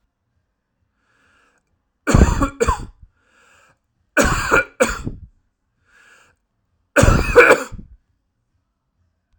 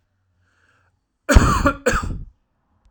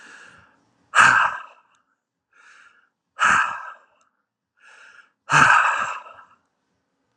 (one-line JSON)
{"three_cough_length": "9.4 s", "three_cough_amplitude": 32768, "three_cough_signal_mean_std_ratio": 0.33, "cough_length": "2.9 s", "cough_amplitude": 32768, "cough_signal_mean_std_ratio": 0.36, "exhalation_length": "7.2 s", "exhalation_amplitude": 29894, "exhalation_signal_mean_std_ratio": 0.36, "survey_phase": "alpha (2021-03-01 to 2021-08-12)", "age": "18-44", "gender": "Male", "wearing_mask": "No", "symptom_none": true, "smoker_status": "Never smoked", "respiratory_condition_asthma": false, "respiratory_condition_other": false, "recruitment_source": "REACT", "submission_delay": "1 day", "covid_test_result": "Negative", "covid_test_method": "RT-qPCR"}